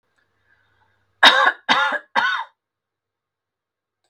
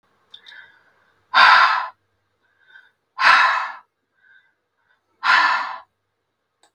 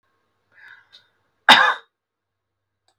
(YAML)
three_cough_length: 4.1 s
three_cough_amplitude: 32768
three_cough_signal_mean_std_ratio: 0.33
exhalation_length: 6.7 s
exhalation_amplitude: 32766
exhalation_signal_mean_std_ratio: 0.37
cough_length: 3.0 s
cough_amplitude: 32768
cough_signal_mean_std_ratio: 0.22
survey_phase: beta (2021-08-13 to 2022-03-07)
age: 65+
gender: Female
wearing_mask: 'No'
symptom_sore_throat: true
symptom_fatigue: true
symptom_onset: 7 days
smoker_status: Never smoked
respiratory_condition_asthma: false
respiratory_condition_other: false
recruitment_source: REACT
submission_delay: 1 day
covid_test_result: Negative
covid_test_method: RT-qPCR
influenza_a_test_result: Negative
influenza_b_test_result: Negative